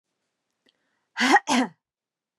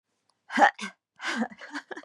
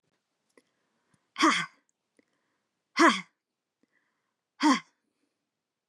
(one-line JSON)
{"cough_length": "2.4 s", "cough_amplitude": 15472, "cough_signal_mean_std_ratio": 0.32, "three_cough_length": "2.0 s", "three_cough_amplitude": 17138, "three_cough_signal_mean_std_ratio": 0.36, "exhalation_length": "5.9 s", "exhalation_amplitude": 14470, "exhalation_signal_mean_std_ratio": 0.25, "survey_phase": "beta (2021-08-13 to 2022-03-07)", "age": "18-44", "gender": "Female", "wearing_mask": "No", "symptom_none": true, "smoker_status": "Never smoked", "respiratory_condition_asthma": false, "respiratory_condition_other": false, "recruitment_source": "REACT", "submission_delay": "2 days", "covid_test_result": "Negative", "covid_test_method": "RT-qPCR", "influenza_a_test_result": "Negative", "influenza_b_test_result": "Negative"}